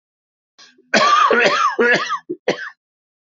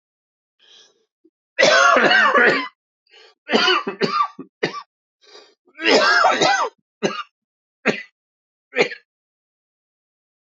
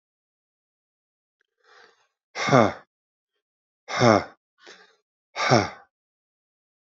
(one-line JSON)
{"cough_length": "3.3 s", "cough_amplitude": 27767, "cough_signal_mean_std_ratio": 0.56, "three_cough_length": "10.4 s", "three_cough_amplitude": 29612, "three_cough_signal_mean_std_ratio": 0.45, "exhalation_length": "6.9 s", "exhalation_amplitude": 23540, "exhalation_signal_mean_std_ratio": 0.26, "survey_phase": "beta (2021-08-13 to 2022-03-07)", "age": "45-64", "gender": "Male", "wearing_mask": "No", "symptom_cough_any": true, "symptom_sore_throat": true, "symptom_change_to_sense_of_smell_or_taste": true, "symptom_onset": "4 days", "smoker_status": "Never smoked", "respiratory_condition_asthma": false, "respiratory_condition_other": false, "recruitment_source": "Test and Trace", "submission_delay": "2 days", "covid_test_result": "Positive", "covid_test_method": "RT-qPCR", "covid_ct_value": 25.2, "covid_ct_gene": "N gene"}